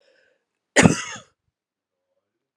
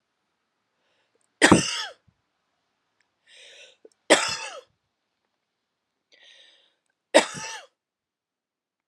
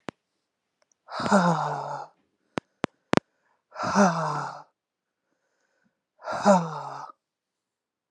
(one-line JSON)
{"cough_length": "2.6 s", "cough_amplitude": 32767, "cough_signal_mean_std_ratio": 0.22, "three_cough_length": "8.9 s", "three_cough_amplitude": 32471, "three_cough_signal_mean_std_ratio": 0.21, "exhalation_length": "8.1 s", "exhalation_amplitude": 32724, "exhalation_signal_mean_std_ratio": 0.36, "survey_phase": "beta (2021-08-13 to 2022-03-07)", "age": "45-64", "gender": "Female", "wearing_mask": "No", "symptom_runny_or_blocked_nose": true, "symptom_onset": "12 days", "smoker_status": "Never smoked", "respiratory_condition_asthma": false, "respiratory_condition_other": false, "recruitment_source": "REACT", "submission_delay": "2 days", "covid_test_result": "Negative", "covid_test_method": "RT-qPCR", "influenza_a_test_result": "Negative", "influenza_b_test_result": "Negative"}